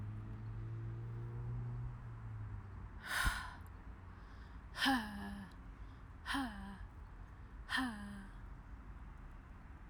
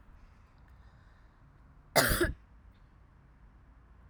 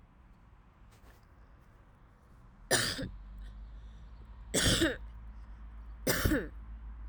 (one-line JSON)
{"exhalation_length": "9.9 s", "exhalation_amplitude": 2663, "exhalation_signal_mean_std_ratio": 0.8, "cough_length": "4.1 s", "cough_amplitude": 12567, "cough_signal_mean_std_ratio": 0.3, "three_cough_length": "7.1 s", "three_cough_amplitude": 6732, "three_cough_signal_mean_std_ratio": 0.49, "survey_phase": "alpha (2021-03-01 to 2021-08-12)", "age": "45-64", "gender": "Female", "wearing_mask": "No", "symptom_none": true, "smoker_status": "Ex-smoker", "respiratory_condition_asthma": false, "respiratory_condition_other": false, "recruitment_source": "REACT", "submission_delay": "1 day", "covid_test_result": "Negative", "covid_test_method": "RT-qPCR"}